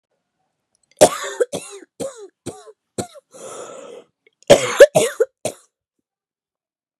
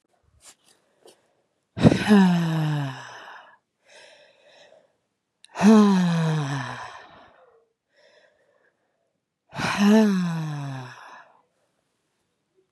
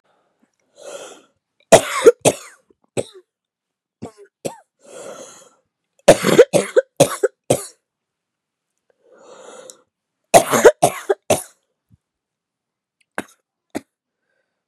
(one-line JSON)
{"cough_length": "7.0 s", "cough_amplitude": 32768, "cough_signal_mean_std_ratio": 0.26, "exhalation_length": "12.7 s", "exhalation_amplitude": 29530, "exhalation_signal_mean_std_ratio": 0.42, "three_cough_length": "14.7 s", "three_cough_amplitude": 32768, "three_cough_signal_mean_std_ratio": 0.25, "survey_phase": "beta (2021-08-13 to 2022-03-07)", "age": "18-44", "gender": "Female", "wearing_mask": "No", "symptom_cough_any": true, "symptom_runny_or_blocked_nose": true, "symptom_fatigue": true, "symptom_headache": true, "symptom_other": true, "symptom_onset": "1 day", "smoker_status": "Ex-smoker", "respiratory_condition_asthma": true, "respiratory_condition_other": false, "recruitment_source": "Test and Trace", "submission_delay": "1 day", "covid_test_result": "Positive", "covid_test_method": "RT-qPCR", "covid_ct_value": 21.6, "covid_ct_gene": "N gene"}